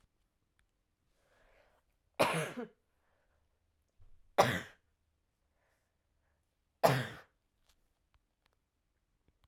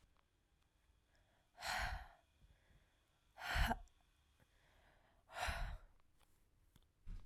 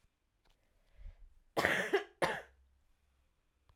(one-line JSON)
{"three_cough_length": "9.5 s", "three_cough_amplitude": 10334, "three_cough_signal_mean_std_ratio": 0.21, "exhalation_length": "7.3 s", "exhalation_amplitude": 1732, "exhalation_signal_mean_std_ratio": 0.37, "cough_length": "3.8 s", "cough_amplitude": 9562, "cough_signal_mean_std_ratio": 0.33, "survey_phase": "beta (2021-08-13 to 2022-03-07)", "age": "18-44", "gender": "Female", "wearing_mask": "Yes", "symptom_cough_any": true, "symptom_new_continuous_cough": true, "symptom_runny_or_blocked_nose": true, "symptom_shortness_of_breath": true, "symptom_sore_throat": true, "symptom_fatigue": true, "symptom_change_to_sense_of_smell_or_taste": true, "symptom_onset": "7 days", "smoker_status": "Never smoked", "respiratory_condition_asthma": false, "respiratory_condition_other": false, "recruitment_source": "Test and Trace", "submission_delay": "2 days", "covid_test_result": "Positive", "covid_test_method": "RT-qPCR", "covid_ct_value": 16.3, "covid_ct_gene": "ORF1ab gene"}